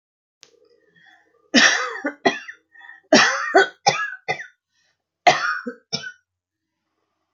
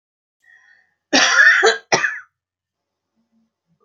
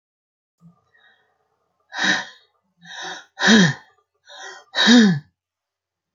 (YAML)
three_cough_length: 7.3 s
three_cough_amplitude: 32768
three_cough_signal_mean_std_ratio: 0.36
cough_length: 3.8 s
cough_amplitude: 30594
cough_signal_mean_std_ratio: 0.38
exhalation_length: 6.1 s
exhalation_amplitude: 27353
exhalation_signal_mean_std_ratio: 0.34
survey_phase: beta (2021-08-13 to 2022-03-07)
age: 65+
gender: Female
wearing_mask: 'No'
symptom_none: true
smoker_status: Never smoked
respiratory_condition_asthma: false
respiratory_condition_other: false
recruitment_source: REACT
submission_delay: 1 day
covid_test_result: Negative
covid_test_method: RT-qPCR